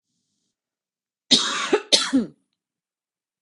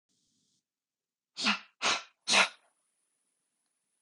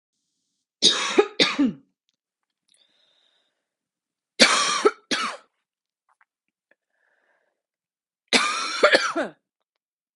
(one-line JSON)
{"cough_length": "3.4 s", "cough_amplitude": 30553, "cough_signal_mean_std_ratio": 0.34, "exhalation_length": "4.0 s", "exhalation_amplitude": 10023, "exhalation_signal_mean_std_ratio": 0.28, "three_cough_length": "10.2 s", "three_cough_amplitude": 32768, "three_cough_signal_mean_std_ratio": 0.34, "survey_phase": "beta (2021-08-13 to 2022-03-07)", "age": "18-44", "gender": "Female", "wearing_mask": "No", "symptom_none": true, "smoker_status": "Current smoker (1 to 10 cigarettes per day)", "respiratory_condition_asthma": true, "respiratory_condition_other": false, "recruitment_source": "Test and Trace", "submission_delay": "0 days", "covid_test_result": "Negative", "covid_test_method": "RT-qPCR"}